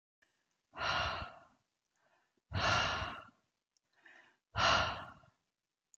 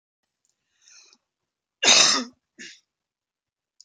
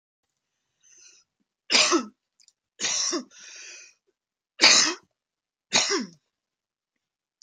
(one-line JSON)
{"exhalation_length": "6.0 s", "exhalation_amplitude": 4379, "exhalation_signal_mean_std_ratio": 0.42, "cough_length": "3.8 s", "cough_amplitude": 27551, "cough_signal_mean_std_ratio": 0.26, "three_cough_length": "7.4 s", "three_cough_amplitude": 25548, "three_cough_signal_mean_std_ratio": 0.32, "survey_phase": "beta (2021-08-13 to 2022-03-07)", "age": "45-64", "gender": "Female", "wearing_mask": "No", "symptom_none": true, "smoker_status": "Never smoked", "respiratory_condition_asthma": false, "respiratory_condition_other": false, "recruitment_source": "REACT", "submission_delay": "1 day", "covid_test_result": "Negative", "covid_test_method": "RT-qPCR"}